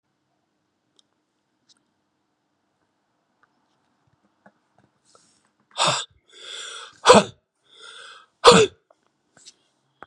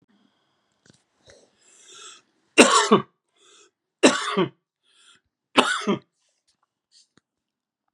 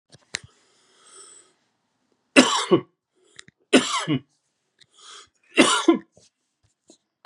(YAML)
exhalation_length: 10.1 s
exhalation_amplitude: 32767
exhalation_signal_mean_std_ratio: 0.19
cough_length: 7.9 s
cough_amplitude: 32767
cough_signal_mean_std_ratio: 0.27
three_cough_length: 7.3 s
three_cough_amplitude: 32204
three_cough_signal_mean_std_ratio: 0.29
survey_phase: beta (2021-08-13 to 2022-03-07)
age: 45-64
gender: Male
wearing_mask: 'No'
symptom_none: true
smoker_status: Ex-smoker
respiratory_condition_asthma: true
respiratory_condition_other: false
recruitment_source: REACT
submission_delay: 6 days
covid_test_result: Negative
covid_test_method: RT-qPCR
influenza_a_test_result: Negative
influenza_b_test_result: Negative